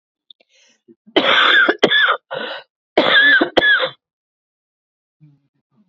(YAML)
cough_length: 5.9 s
cough_amplitude: 32768
cough_signal_mean_std_ratio: 0.48
survey_phase: beta (2021-08-13 to 2022-03-07)
age: 45-64
gender: Female
wearing_mask: 'No'
symptom_runny_or_blocked_nose: true
symptom_abdominal_pain: true
symptom_fatigue: true
symptom_headache: true
symptom_change_to_sense_of_smell_or_taste: true
smoker_status: Ex-smoker
respiratory_condition_asthma: true
respiratory_condition_other: false
recruitment_source: REACT
submission_delay: 3 days
covid_test_result: Negative
covid_test_method: RT-qPCR
influenza_a_test_result: Negative
influenza_b_test_result: Negative